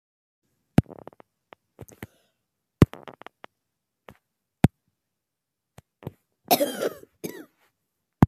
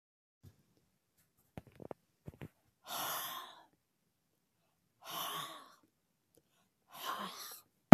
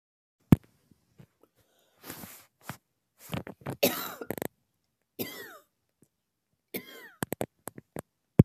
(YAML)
cough_length: 8.3 s
cough_amplitude: 25572
cough_signal_mean_std_ratio: 0.15
exhalation_length: 7.9 s
exhalation_amplitude: 23923
exhalation_signal_mean_std_ratio: 0.11
three_cough_length: 8.4 s
three_cough_amplitude: 23723
three_cough_signal_mean_std_ratio: 0.17
survey_phase: beta (2021-08-13 to 2022-03-07)
age: 65+
gender: Female
wearing_mask: 'No'
symptom_runny_or_blocked_nose: true
smoker_status: Ex-smoker
respiratory_condition_asthma: false
respiratory_condition_other: false
recruitment_source: REACT
submission_delay: 2 days
covid_test_result: Negative
covid_test_method: RT-qPCR
influenza_a_test_result: Negative
influenza_b_test_result: Negative